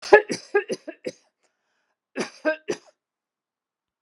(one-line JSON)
{"cough_length": "4.0 s", "cough_amplitude": 32767, "cough_signal_mean_std_ratio": 0.24, "survey_phase": "alpha (2021-03-01 to 2021-08-12)", "age": "45-64", "gender": "Female", "wearing_mask": "No", "symptom_none": true, "symptom_onset": "13 days", "smoker_status": "Never smoked", "respiratory_condition_asthma": false, "respiratory_condition_other": false, "recruitment_source": "REACT", "submission_delay": "1 day", "covid_test_result": "Negative", "covid_test_method": "RT-qPCR"}